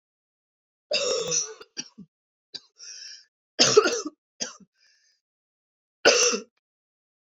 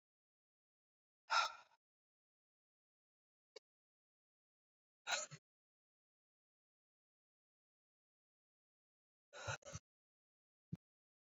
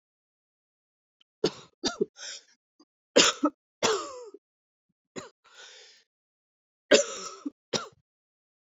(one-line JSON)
{"three_cough_length": "7.3 s", "three_cough_amplitude": 25516, "three_cough_signal_mean_std_ratio": 0.33, "exhalation_length": "11.3 s", "exhalation_amplitude": 2456, "exhalation_signal_mean_std_ratio": 0.17, "cough_length": "8.8 s", "cough_amplitude": 18682, "cough_signal_mean_std_ratio": 0.26, "survey_phase": "beta (2021-08-13 to 2022-03-07)", "age": "18-44", "gender": "Female", "wearing_mask": "No", "symptom_cough_any": true, "symptom_new_continuous_cough": true, "symptom_runny_or_blocked_nose": true, "symptom_shortness_of_breath": true, "symptom_sore_throat": true, "symptom_fatigue": true, "symptom_fever_high_temperature": true, "symptom_headache": true, "symptom_change_to_sense_of_smell_or_taste": true, "symptom_onset": "4 days", "smoker_status": "Never smoked", "respiratory_condition_asthma": false, "respiratory_condition_other": false, "recruitment_source": "Test and Trace", "submission_delay": "3 days", "covid_test_result": "Positive", "covid_test_method": "RT-qPCR"}